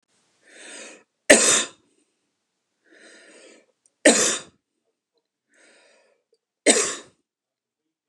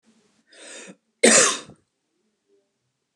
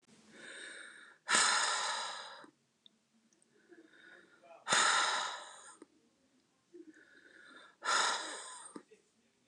three_cough_length: 8.1 s
three_cough_amplitude: 29204
three_cough_signal_mean_std_ratio: 0.26
cough_length: 3.2 s
cough_amplitude: 29204
cough_signal_mean_std_ratio: 0.27
exhalation_length: 9.5 s
exhalation_amplitude: 6359
exhalation_signal_mean_std_ratio: 0.43
survey_phase: beta (2021-08-13 to 2022-03-07)
age: 45-64
gender: Female
wearing_mask: 'No'
symptom_none: true
smoker_status: Never smoked
respiratory_condition_asthma: false
respiratory_condition_other: false
recruitment_source: REACT
submission_delay: 2 days
covid_test_result: Negative
covid_test_method: RT-qPCR
influenza_a_test_result: Negative
influenza_b_test_result: Negative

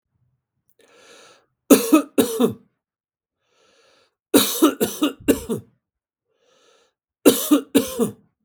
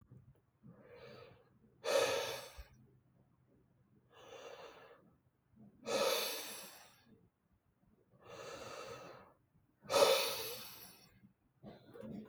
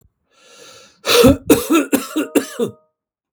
three_cough_length: 8.4 s
three_cough_amplitude: 32768
three_cough_signal_mean_std_ratio: 0.35
exhalation_length: 12.3 s
exhalation_amplitude: 5397
exhalation_signal_mean_std_ratio: 0.38
cough_length: 3.3 s
cough_amplitude: 32768
cough_signal_mean_std_ratio: 0.44
survey_phase: beta (2021-08-13 to 2022-03-07)
age: 45-64
gender: Male
wearing_mask: 'No'
symptom_cough_any: true
symptom_runny_or_blocked_nose: true
symptom_shortness_of_breath: true
symptom_sore_throat: true
symptom_fatigue: true
symptom_headache: true
symptom_other: true
symptom_onset: 2 days
smoker_status: Ex-smoker
respiratory_condition_asthma: true
respiratory_condition_other: false
recruitment_source: Test and Trace
submission_delay: 2 days
covid_test_result: Positive
covid_test_method: ePCR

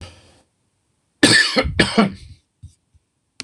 three_cough_length: 3.4 s
three_cough_amplitude: 26028
three_cough_signal_mean_std_ratio: 0.37
survey_phase: beta (2021-08-13 to 2022-03-07)
age: 65+
gender: Male
wearing_mask: 'No'
symptom_none: true
smoker_status: Ex-smoker
respiratory_condition_asthma: false
respiratory_condition_other: false
recruitment_source: REACT
submission_delay: 0 days
covid_test_result: Negative
covid_test_method: RT-qPCR
influenza_a_test_result: Negative
influenza_b_test_result: Negative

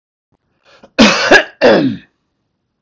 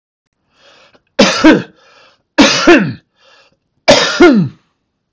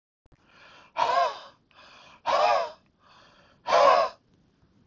cough_length: 2.8 s
cough_amplitude: 32768
cough_signal_mean_std_ratio: 0.43
three_cough_length: 5.1 s
three_cough_amplitude: 32768
three_cough_signal_mean_std_ratio: 0.45
exhalation_length: 4.9 s
exhalation_amplitude: 14079
exhalation_signal_mean_std_ratio: 0.42
survey_phase: beta (2021-08-13 to 2022-03-07)
age: 65+
gender: Male
wearing_mask: 'No'
symptom_none: true
smoker_status: Never smoked
respiratory_condition_asthma: true
respiratory_condition_other: false
recruitment_source: REACT
submission_delay: 1 day
covid_test_result: Negative
covid_test_method: RT-qPCR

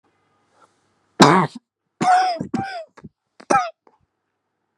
three_cough_length: 4.8 s
three_cough_amplitude: 32768
three_cough_signal_mean_std_ratio: 0.35
survey_phase: beta (2021-08-13 to 2022-03-07)
age: 18-44
gender: Female
wearing_mask: 'No'
symptom_cough_any: true
symptom_runny_or_blocked_nose: true
symptom_sore_throat: true
symptom_fatigue: true
symptom_fever_high_temperature: true
symptom_headache: true
symptom_change_to_sense_of_smell_or_taste: true
symptom_loss_of_taste: true
symptom_onset: 2 days
smoker_status: Never smoked
respiratory_condition_asthma: false
respiratory_condition_other: false
recruitment_source: Test and Trace
submission_delay: 2 days
covid_test_result: Positive
covid_test_method: RT-qPCR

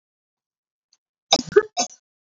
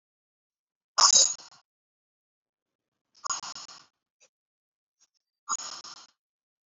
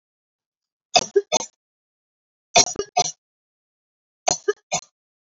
cough_length: 2.4 s
cough_amplitude: 32767
cough_signal_mean_std_ratio: 0.21
exhalation_length: 6.7 s
exhalation_amplitude: 19714
exhalation_signal_mean_std_ratio: 0.22
three_cough_length: 5.4 s
three_cough_amplitude: 32767
three_cough_signal_mean_std_ratio: 0.25
survey_phase: beta (2021-08-13 to 2022-03-07)
age: 18-44
gender: Female
wearing_mask: 'No'
symptom_none: true
smoker_status: Never smoked
respiratory_condition_asthma: false
respiratory_condition_other: false
recruitment_source: REACT
submission_delay: 2 days
covid_test_result: Negative
covid_test_method: RT-qPCR
influenza_a_test_result: Negative
influenza_b_test_result: Negative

